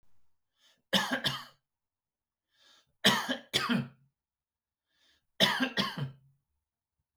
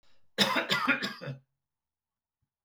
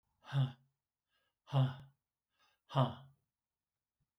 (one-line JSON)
{"three_cough_length": "7.2 s", "three_cough_amplitude": 11521, "three_cough_signal_mean_std_ratio": 0.36, "cough_length": "2.6 s", "cough_amplitude": 11810, "cough_signal_mean_std_ratio": 0.43, "exhalation_length": "4.2 s", "exhalation_amplitude": 3224, "exhalation_signal_mean_std_ratio": 0.31, "survey_phase": "beta (2021-08-13 to 2022-03-07)", "age": "65+", "gender": "Male", "wearing_mask": "No", "symptom_none": true, "smoker_status": "Never smoked", "respiratory_condition_asthma": false, "respiratory_condition_other": false, "recruitment_source": "REACT", "submission_delay": "2 days", "covid_test_result": "Negative", "covid_test_method": "RT-qPCR", "influenza_a_test_result": "Negative", "influenza_b_test_result": "Negative"}